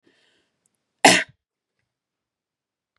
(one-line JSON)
{"cough_length": "3.0 s", "cough_amplitude": 32096, "cough_signal_mean_std_ratio": 0.18, "survey_phase": "beta (2021-08-13 to 2022-03-07)", "age": "18-44", "gender": "Female", "wearing_mask": "No", "symptom_runny_or_blocked_nose": true, "symptom_headache": true, "symptom_onset": "3 days", "smoker_status": "Never smoked", "respiratory_condition_asthma": false, "respiratory_condition_other": false, "recruitment_source": "Test and Trace", "submission_delay": "1 day", "covid_test_result": "Positive", "covid_test_method": "RT-qPCR", "covid_ct_value": 29.2, "covid_ct_gene": "N gene"}